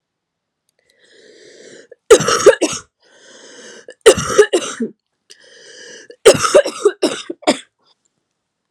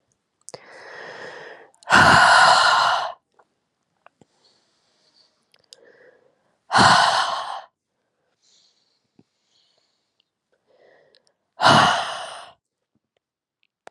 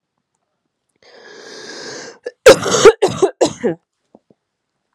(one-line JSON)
{"three_cough_length": "8.7 s", "three_cough_amplitude": 32768, "three_cough_signal_mean_std_ratio": 0.33, "exhalation_length": "13.9 s", "exhalation_amplitude": 30340, "exhalation_signal_mean_std_ratio": 0.34, "cough_length": "4.9 s", "cough_amplitude": 32768, "cough_signal_mean_std_ratio": 0.31, "survey_phase": "beta (2021-08-13 to 2022-03-07)", "age": "18-44", "gender": "Female", "wearing_mask": "No", "symptom_cough_any": true, "symptom_runny_or_blocked_nose": true, "symptom_sore_throat": true, "symptom_fatigue": true, "symptom_headache": true, "symptom_onset": "3 days", "smoker_status": "Current smoker (e-cigarettes or vapes only)", "respiratory_condition_asthma": false, "respiratory_condition_other": false, "recruitment_source": "Test and Trace", "submission_delay": "2 days", "covid_test_result": "Positive", "covid_test_method": "RT-qPCR", "covid_ct_value": 17.1, "covid_ct_gene": "ORF1ab gene", "covid_ct_mean": 17.3, "covid_viral_load": "2200000 copies/ml", "covid_viral_load_category": "High viral load (>1M copies/ml)"}